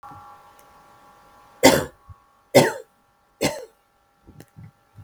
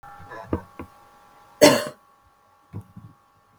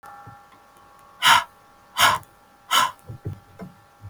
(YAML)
three_cough_length: 5.0 s
three_cough_amplitude: 32768
three_cough_signal_mean_std_ratio: 0.26
cough_length: 3.6 s
cough_amplitude: 32768
cough_signal_mean_std_ratio: 0.25
exhalation_length: 4.1 s
exhalation_amplitude: 29179
exhalation_signal_mean_std_ratio: 0.35
survey_phase: beta (2021-08-13 to 2022-03-07)
age: 65+
gender: Female
wearing_mask: 'No'
symptom_headache: true
smoker_status: Never smoked
respiratory_condition_asthma: false
respiratory_condition_other: false
recruitment_source: REACT
submission_delay: 2 days
covid_test_result: Positive
covid_test_method: RT-qPCR
covid_ct_value: 21.0
covid_ct_gene: E gene
influenza_a_test_result: Negative
influenza_b_test_result: Negative